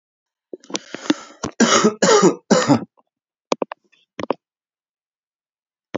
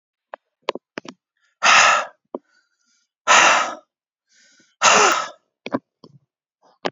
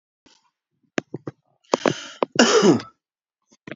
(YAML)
three_cough_length: 6.0 s
three_cough_amplitude: 29760
three_cough_signal_mean_std_ratio: 0.35
exhalation_length: 6.9 s
exhalation_amplitude: 28738
exhalation_signal_mean_std_ratio: 0.36
cough_length: 3.8 s
cough_amplitude: 32767
cough_signal_mean_std_ratio: 0.32
survey_phase: beta (2021-08-13 to 2022-03-07)
age: 45-64
gender: Male
wearing_mask: 'No'
symptom_none: true
smoker_status: Ex-smoker
respiratory_condition_asthma: false
respiratory_condition_other: false
recruitment_source: REACT
submission_delay: 5 days
covid_test_result: Negative
covid_test_method: RT-qPCR